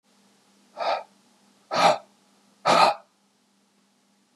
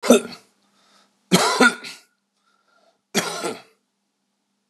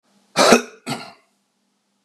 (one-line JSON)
{"exhalation_length": "4.4 s", "exhalation_amplitude": 23271, "exhalation_signal_mean_std_ratio": 0.33, "three_cough_length": "4.7 s", "three_cough_amplitude": 32694, "three_cough_signal_mean_std_ratio": 0.32, "cough_length": "2.0 s", "cough_amplitude": 32768, "cough_signal_mean_std_ratio": 0.31, "survey_phase": "beta (2021-08-13 to 2022-03-07)", "age": "45-64", "gender": "Male", "wearing_mask": "No", "symptom_none": true, "smoker_status": "Ex-smoker", "respiratory_condition_asthma": false, "respiratory_condition_other": false, "recruitment_source": "Test and Trace", "submission_delay": "2 days", "covid_test_result": "Positive", "covid_test_method": "RT-qPCR", "covid_ct_value": 28.9, "covid_ct_gene": "N gene"}